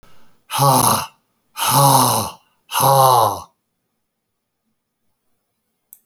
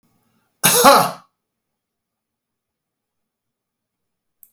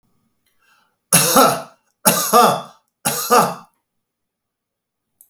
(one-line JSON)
{"exhalation_length": "6.1 s", "exhalation_amplitude": 32767, "exhalation_signal_mean_std_ratio": 0.46, "cough_length": "4.5 s", "cough_amplitude": 32768, "cough_signal_mean_std_ratio": 0.25, "three_cough_length": "5.3 s", "three_cough_amplitude": 32768, "three_cough_signal_mean_std_ratio": 0.4, "survey_phase": "beta (2021-08-13 to 2022-03-07)", "age": "65+", "gender": "Male", "wearing_mask": "No", "symptom_none": true, "smoker_status": "Ex-smoker", "respiratory_condition_asthma": false, "respiratory_condition_other": false, "recruitment_source": "REACT", "submission_delay": "1 day", "covid_test_result": "Negative", "covid_test_method": "RT-qPCR"}